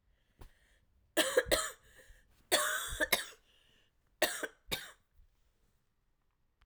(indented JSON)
{
  "three_cough_length": "6.7 s",
  "three_cough_amplitude": 7678,
  "three_cough_signal_mean_std_ratio": 0.34,
  "survey_phase": "alpha (2021-03-01 to 2021-08-12)",
  "age": "18-44",
  "gender": "Female",
  "wearing_mask": "No",
  "symptom_cough_any": true,
  "symptom_new_continuous_cough": true,
  "symptom_shortness_of_breath": true,
  "symptom_fatigue": true,
  "symptom_headache": true,
  "smoker_status": "Never smoked",
  "respiratory_condition_asthma": false,
  "respiratory_condition_other": false,
  "recruitment_source": "Test and Trace",
  "submission_delay": "2 days",
  "covid_test_result": "Positive",
  "covid_test_method": "RT-qPCR",
  "covid_ct_value": 24.0,
  "covid_ct_gene": "ORF1ab gene",
  "covid_ct_mean": 24.5,
  "covid_viral_load": "9200 copies/ml",
  "covid_viral_load_category": "Minimal viral load (< 10K copies/ml)"
}